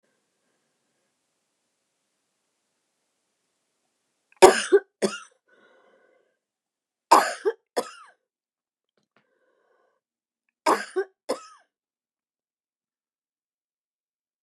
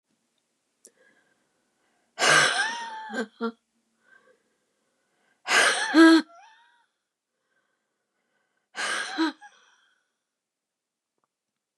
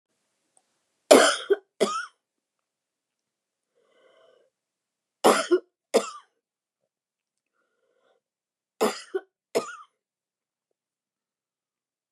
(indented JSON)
{
  "cough_length": "14.4 s",
  "cough_amplitude": 29204,
  "cough_signal_mean_std_ratio": 0.17,
  "exhalation_length": "11.8 s",
  "exhalation_amplitude": 18904,
  "exhalation_signal_mean_std_ratio": 0.3,
  "three_cough_length": "12.1 s",
  "three_cough_amplitude": 29183,
  "three_cough_signal_mean_std_ratio": 0.22,
  "survey_phase": "beta (2021-08-13 to 2022-03-07)",
  "age": "65+",
  "gender": "Female",
  "wearing_mask": "No",
  "symptom_none": true,
  "smoker_status": "Never smoked",
  "respiratory_condition_asthma": false,
  "respiratory_condition_other": false,
  "recruitment_source": "REACT",
  "submission_delay": "1 day",
  "covid_test_result": "Negative",
  "covid_test_method": "RT-qPCR",
  "influenza_a_test_result": "Negative",
  "influenza_b_test_result": "Negative"
}